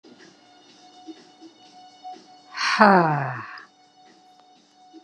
{"exhalation_length": "5.0 s", "exhalation_amplitude": 30587, "exhalation_signal_mean_std_ratio": 0.32, "survey_phase": "beta (2021-08-13 to 2022-03-07)", "age": "65+", "gender": "Female", "wearing_mask": "No", "symptom_other": true, "smoker_status": "Ex-smoker", "respiratory_condition_asthma": false, "respiratory_condition_other": false, "recruitment_source": "REACT", "submission_delay": "6 days", "covid_test_result": "Negative", "covid_test_method": "RT-qPCR"}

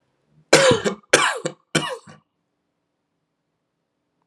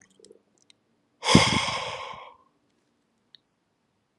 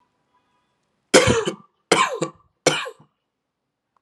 {"cough_length": "4.3 s", "cough_amplitude": 32767, "cough_signal_mean_std_ratio": 0.32, "exhalation_length": "4.2 s", "exhalation_amplitude": 28517, "exhalation_signal_mean_std_ratio": 0.28, "three_cough_length": "4.0 s", "three_cough_amplitude": 32386, "three_cough_signal_mean_std_ratio": 0.33, "survey_phase": "alpha (2021-03-01 to 2021-08-12)", "age": "18-44", "gender": "Male", "wearing_mask": "No", "symptom_none": true, "smoker_status": "Ex-smoker", "respiratory_condition_asthma": false, "respiratory_condition_other": false, "recruitment_source": "REACT", "submission_delay": "4 days", "covid_test_result": "Negative", "covid_test_method": "RT-qPCR"}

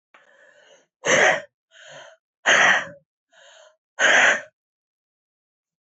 {"exhalation_length": "5.8 s", "exhalation_amplitude": 22993, "exhalation_signal_mean_std_ratio": 0.37, "survey_phase": "beta (2021-08-13 to 2022-03-07)", "age": "18-44", "gender": "Female", "wearing_mask": "No", "symptom_cough_any": true, "symptom_new_continuous_cough": true, "symptom_runny_or_blocked_nose": true, "symptom_sore_throat": true, "symptom_abdominal_pain": true, "symptom_diarrhoea": true, "symptom_fatigue": true, "symptom_headache": true, "symptom_change_to_sense_of_smell_or_taste": true, "symptom_loss_of_taste": true, "symptom_onset": "2 days", "smoker_status": "Current smoker (11 or more cigarettes per day)", "respiratory_condition_asthma": false, "respiratory_condition_other": false, "recruitment_source": "Test and Trace", "submission_delay": "1 day", "covid_test_result": "Positive", "covid_test_method": "RT-qPCR", "covid_ct_value": 20.6, "covid_ct_gene": "ORF1ab gene", "covid_ct_mean": 21.2, "covid_viral_load": "110000 copies/ml", "covid_viral_load_category": "Low viral load (10K-1M copies/ml)"}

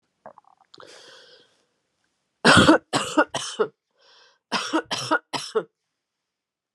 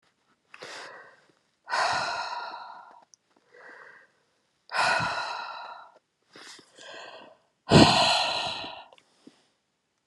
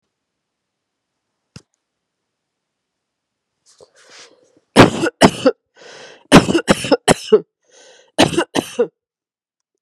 {"three_cough_length": "6.7 s", "three_cough_amplitude": 30939, "three_cough_signal_mean_std_ratio": 0.32, "exhalation_length": "10.1 s", "exhalation_amplitude": 23933, "exhalation_signal_mean_std_ratio": 0.37, "cough_length": "9.8 s", "cough_amplitude": 32768, "cough_signal_mean_std_ratio": 0.28, "survey_phase": "beta (2021-08-13 to 2022-03-07)", "age": "45-64", "gender": "Female", "wearing_mask": "No", "symptom_none": true, "smoker_status": "Ex-smoker", "respiratory_condition_asthma": true, "respiratory_condition_other": false, "recruitment_source": "REACT", "submission_delay": "2 days", "covid_test_result": "Negative", "covid_test_method": "RT-qPCR"}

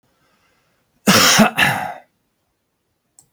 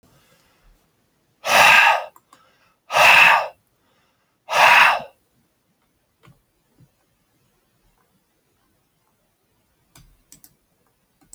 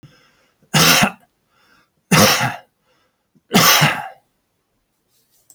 {"cough_length": "3.3 s", "cough_amplitude": 32768, "cough_signal_mean_std_ratio": 0.38, "exhalation_length": "11.3 s", "exhalation_amplitude": 31150, "exhalation_signal_mean_std_ratio": 0.3, "three_cough_length": "5.5 s", "three_cough_amplitude": 32768, "three_cough_signal_mean_std_ratio": 0.39, "survey_phase": "beta (2021-08-13 to 2022-03-07)", "age": "45-64", "gender": "Male", "wearing_mask": "No", "symptom_none": true, "smoker_status": "Never smoked", "respiratory_condition_asthma": false, "respiratory_condition_other": false, "recruitment_source": "REACT", "submission_delay": "1 day", "covid_test_result": "Negative", "covid_test_method": "RT-qPCR"}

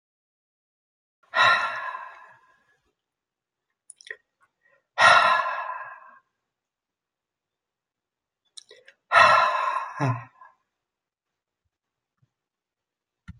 {"exhalation_length": "13.4 s", "exhalation_amplitude": 25558, "exhalation_signal_mean_std_ratio": 0.3, "survey_phase": "beta (2021-08-13 to 2022-03-07)", "age": "65+", "gender": "Male", "wearing_mask": "No", "symptom_runny_or_blocked_nose": true, "symptom_headache": true, "symptom_onset": "9 days", "smoker_status": "Never smoked", "respiratory_condition_asthma": false, "respiratory_condition_other": false, "recruitment_source": "REACT", "submission_delay": "2 days", "covid_test_result": "Negative", "covid_test_method": "RT-qPCR"}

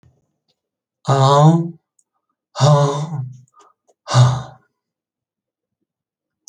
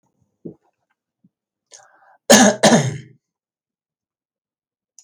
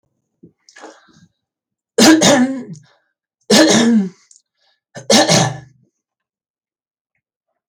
{"exhalation_length": "6.5 s", "exhalation_amplitude": 28061, "exhalation_signal_mean_std_ratio": 0.4, "cough_length": "5.0 s", "cough_amplitude": 32768, "cough_signal_mean_std_ratio": 0.26, "three_cough_length": "7.7 s", "three_cough_amplitude": 32768, "three_cough_signal_mean_std_ratio": 0.39, "survey_phase": "beta (2021-08-13 to 2022-03-07)", "age": "65+", "gender": "Male", "wearing_mask": "No", "symptom_none": true, "smoker_status": "Never smoked", "respiratory_condition_asthma": false, "respiratory_condition_other": false, "recruitment_source": "REACT", "submission_delay": "1 day", "covid_test_result": "Negative", "covid_test_method": "RT-qPCR"}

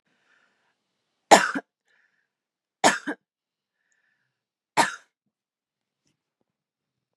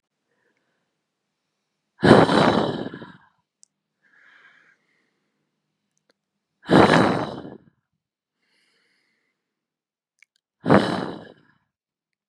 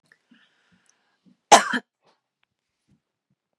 {"three_cough_length": "7.2 s", "three_cough_amplitude": 32767, "three_cough_signal_mean_std_ratio": 0.18, "exhalation_length": "12.3 s", "exhalation_amplitude": 32768, "exhalation_signal_mean_std_ratio": 0.27, "cough_length": "3.6 s", "cough_amplitude": 32767, "cough_signal_mean_std_ratio": 0.16, "survey_phase": "beta (2021-08-13 to 2022-03-07)", "age": "18-44", "gender": "Female", "wearing_mask": "No", "symptom_none": true, "smoker_status": "Never smoked", "respiratory_condition_asthma": false, "respiratory_condition_other": false, "recruitment_source": "REACT", "submission_delay": "1 day", "covid_test_result": "Negative", "covid_test_method": "RT-qPCR", "influenza_a_test_result": "Negative", "influenza_b_test_result": "Negative"}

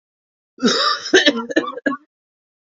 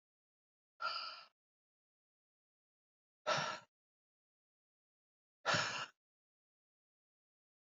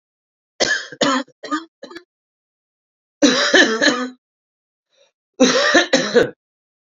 {"cough_length": "2.7 s", "cough_amplitude": 31584, "cough_signal_mean_std_ratio": 0.46, "exhalation_length": "7.7 s", "exhalation_amplitude": 2389, "exhalation_signal_mean_std_ratio": 0.27, "three_cough_length": "7.0 s", "three_cough_amplitude": 32768, "three_cough_signal_mean_std_ratio": 0.44, "survey_phase": "beta (2021-08-13 to 2022-03-07)", "age": "18-44", "gender": "Male", "wearing_mask": "No", "symptom_cough_any": true, "symptom_fatigue": true, "symptom_onset": "3 days", "smoker_status": "Never smoked", "respiratory_condition_asthma": false, "respiratory_condition_other": false, "recruitment_source": "Test and Trace", "submission_delay": "2 days", "covid_test_result": "Positive", "covid_test_method": "RT-qPCR", "covid_ct_value": 13.8, "covid_ct_gene": "N gene", "covid_ct_mean": 13.9, "covid_viral_load": "27000000 copies/ml", "covid_viral_load_category": "High viral load (>1M copies/ml)"}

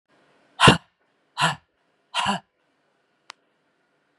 {"exhalation_length": "4.2 s", "exhalation_amplitude": 32768, "exhalation_signal_mean_std_ratio": 0.24, "survey_phase": "beta (2021-08-13 to 2022-03-07)", "age": "45-64", "gender": "Female", "wearing_mask": "No", "symptom_loss_of_taste": true, "smoker_status": "Ex-smoker", "respiratory_condition_asthma": false, "respiratory_condition_other": false, "recruitment_source": "Test and Trace", "submission_delay": "2 days", "covid_test_result": "Positive", "covid_test_method": "RT-qPCR", "covid_ct_value": 32.4, "covid_ct_gene": "N gene"}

